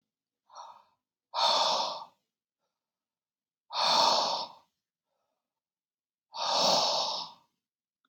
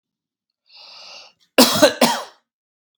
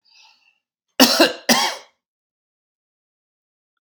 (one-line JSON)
{"exhalation_length": "8.1 s", "exhalation_amplitude": 10066, "exhalation_signal_mean_std_ratio": 0.44, "three_cough_length": "3.0 s", "three_cough_amplitude": 32768, "three_cough_signal_mean_std_ratio": 0.32, "cough_length": "3.8 s", "cough_amplitude": 32768, "cough_signal_mean_std_ratio": 0.28, "survey_phase": "beta (2021-08-13 to 2022-03-07)", "age": "45-64", "gender": "Male", "wearing_mask": "No", "symptom_none": true, "smoker_status": "Ex-smoker", "respiratory_condition_asthma": false, "respiratory_condition_other": false, "recruitment_source": "REACT", "submission_delay": "1 day", "covid_test_result": "Negative", "covid_test_method": "RT-qPCR"}